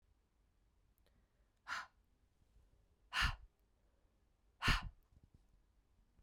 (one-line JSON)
{"exhalation_length": "6.2 s", "exhalation_amplitude": 3012, "exhalation_signal_mean_std_ratio": 0.25, "survey_phase": "beta (2021-08-13 to 2022-03-07)", "age": "18-44", "gender": "Female", "wearing_mask": "No", "symptom_cough_any": true, "symptom_runny_or_blocked_nose": true, "symptom_diarrhoea": true, "symptom_fatigue": true, "symptom_fever_high_temperature": true, "symptom_onset": "2 days", "smoker_status": "Never smoked", "respiratory_condition_asthma": false, "respiratory_condition_other": false, "recruitment_source": "Test and Trace", "submission_delay": "1 day", "covid_test_result": "Positive", "covid_test_method": "RT-qPCR", "covid_ct_value": 23.6, "covid_ct_gene": "ORF1ab gene", "covid_ct_mean": 24.4, "covid_viral_load": "10000 copies/ml", "covid_viral_load_category": "Low viral load (10K-1M copies/ml)"}